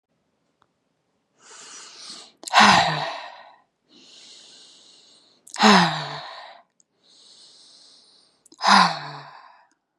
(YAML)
exhalation_length: 10.0 s
exhalation_amplitude: 30363
exhalation_signal_mean_std_ratio: 0.31
survey_phase: beta (2021-08-13 to 2022-03-07)
age: 18-44
gender: Female
wearing_mask: 'No'
symptom_fatigue: true
symptom_onset: 12 days
smoker_status: Current smoker (1 to 10 cigarettes per day)
respiratory_condition_asthma: false
respiratory_condition_other: false
recruitment_source: REACT
submission_delay: 3 days
covid_test_result: Negative
covid_test_method: RT-qPCR
influenza_a_test_result: Negative
influenza_b_test_result: Negative